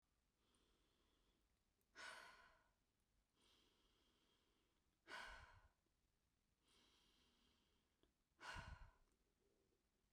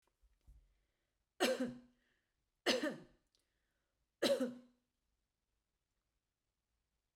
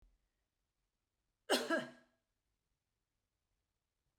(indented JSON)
{
  "exhalation_length": "10.1 s",
  "exhalation_amplitude": 219,
  "exhalation_signal_mean_std_ratio": 0.39,
  "three_cough_length": "7.2 s",
  "three_cough_amplitude": 3060,
  "three_cough_signal_mean_std_ratio": 0.28,
  "cough_length": "4.2 s",
  "cough_amplitude": 2831,
  "cough_signal_mean_std_ratio": 0.22,
  "survey_phase": "beta (2021-08-13 to 2022-03-07)",
  "age": "45-64",
  "gender": "Female",
  "wearing_mask": "No",
  "symptom_none": true,
  "smoker_status": "Never smoked",
  "respiratory_condition_asthma": false,
  "respiratory_condition_other": false,
  "recruitment_source": "REACT",
  "submission_delay": "2 days",
  "covid_test_result": "Negative",
  "covid_test_method": "RT-qPCR"
}